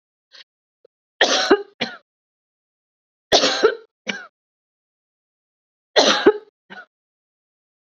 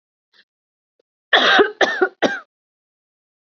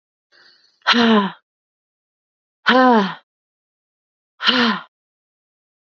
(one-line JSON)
{"three_cough_length": "7.9 s", "three_cough_amplitude": 29141, "three_cough_signal_mean_std_ratio": 0.3, "cough_length": "3.6 s", "cough_amplitude": 29087, "cough_signal_mean_std_ratio": 0.35, "exhalation_length": "5.9 s", "exhalation_amplitude": 27678, "exhalation_signal_mean_std_ratio": 0.37, "survey_phase": "beta (2021-08-13 to 2022-03-07)", "age": "18-44", "gender": "Female", "wearing_mask": "No", "symptom_cough_any": true, "symptom_runny_or_blocked_nose": true, "smoker_status": "Never smoked", "respiratory_condition_asthma": false, "respiratory_condition_other": false, "recruitment_source": "REACT", "submission_delay": "2 days", "covid_test_result": "Negative", "covid_test_method": "RT-qPCR", "influenza_a_test_result": "Negative", "influenza_b_test_result": "Negative"}